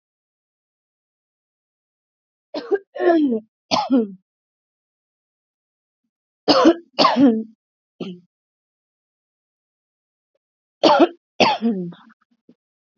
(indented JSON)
{
  "three_cough_length": "13.0 s",
  "three_cough_amplitude": 28645,
  "three_cough_signal_mean_std_ratio": 0.33,
  "survey_phase": "alpha (2021-03-01 to 2021-08-12)",
  "age": "18-44",
  "gender": "Female",
  "wearing_mask": "No",
  "symptom_cough_any": true,
  "symptom_new_continuous_cough": true,
  "symptom_diarrhoea": true,
  "symptom_fatigue": true,
  "symptom_fever_high_temperature": true,
  "symptom_headache": true,
  "symptom_change_to_sense_of_smell_or_taste": true,
  "symptom_loss_of_taste": true,
  "symptom_onset": "4 days",
  "smoker_status": "Ex-smoker",
  "respiratory_condition_asthma": false,
  "respiratory_condition_other": false,
  "recruitment_source": "Test and Trace",
  "submission_delay": "2 days",
  "covid_test_result": "Positive",
  "covid_test_method": "RT-qPCR",
  "covid_ct_value": 20.1,
  "covid_ct_gene": "ORF1ab gene"
}